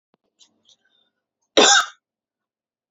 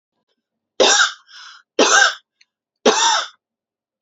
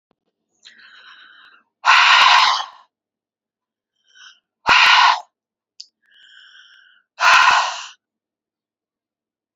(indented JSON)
{
  "cough_length": "2.9 s",
  "cough_amplitude": 29606,
  "cough_signal_mean_std_ratio": 0.25,
  "three_cough_length": "4.0 s",
  "three_cough_amplitude": 30891,
  "three_cough_signal_mean_std_ratio": 0.42,
  "exhalation_length": "9.6 s",
  "exhalation_amplitude": 31522,
  "exhalation_signal_mean_std_ratio": 0.37,
  "survey_phase": "beta (2021-08-13 to 2022-03-07)",
  "age": "18-44",
  "gender": "Female",
  "wearing_mask": "No",
  "symptom_none": true,
  "smoker_status": "Ex-smoker",
  "respiratory_condition_asthma": false,
  "respiratory_condition_other": false,
  "recruitment_source": "REACT",
  "submission_delay": "0 days",
  "covid_test_result": "Negative",
  "covid_test_method": "RT-qPCR",
  "influenza_a_test_result": "Negative",
  "influenza_b_test_result": "Negative"
}